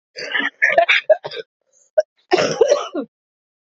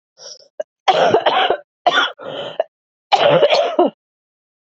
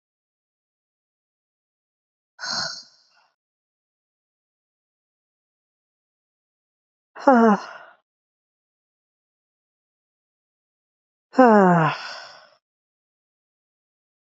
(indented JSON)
{
  "cough_length": "3.7 s",
  "cough_amplitude": 28051,
  "cough_signal_mean_std_ratio": 0.46,
  "three_cough_length": "4.6 s",
  "three_cough_amplitude": 32767,
  "three_cough_signal_mean_std_ratio": 0.53,
  "exhalation_length": "14.3 s",
  "exhalation_amplitude": 26512,
  "exhalation_signal_mean_std_ratio": 0.21,
  "survey_phase": "beta (2021-08-13 to 2022-03-07)",
  "age": "18-44",
  "gender": "Female",
  "wearing_mask": "No",
  "symptom_cough_any": true,
  "symptom_new_continuous_cough": true,
  "symptom_runny_or_blocked_nose": true,
  "symptom_shortness_of_breath": true,
  "symptom_sore_throat": true,
  "symptom_fatigue": true,
  "symptom_fever_high_temperature": true,
  "symptom_headache": true,
  "symptom_change_to_sense_of_smell_or_taste": true,
  "symptom_loss_of_taste": true,
  "symptom_other": true,
  "symptom_onset": "4 days",
  "smoker_status": "Ex-smoker",
  "respiratory_condition_asthma": false,
  "respiratory_condition_other": false,
  "recruitment_source": "Test and Trace",
  "submission_delay": "1 day",
  "covid_test_result": "Positive",
  "covid_test_method": "RT-qPCR",
  "covid_ct_value": 14.5,
  "covid_ct_gene": "N gene",
  "covid_ct_mean": 15.0,
  "covid_viral_load": "12000000 copies/ml",
  "covid_viral_load_category": "High viral load (>1M copies/ml)"
}